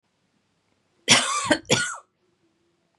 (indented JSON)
{
  "cough_length": "3.0 s",
  "cough_amplitude": 26871,
  "cough_signal_mean_std_ratio": 0.35,
  "survey_phase": "beta (2021-08-13 to 2022-03-07)",
  "age": "18-44",
  "gender": "Female",
  "wearing_mask": "No",
  "symptom_change_to_sense_of_smell_or_taste": true,
  "smoker_status": "Never smoked",
  "respiratory_condition_asthma": false,
  "respiratory_condition_other": false,
  "recruitment_source": "REACT",
  "submission_delay": "1 day",
  "covid_test_result": "Negative",
  "covid_test_method": "RT-qPCR",
  "influenza_a_test_result": "Negative",
  "influenza_b_test_result": "Negative"
}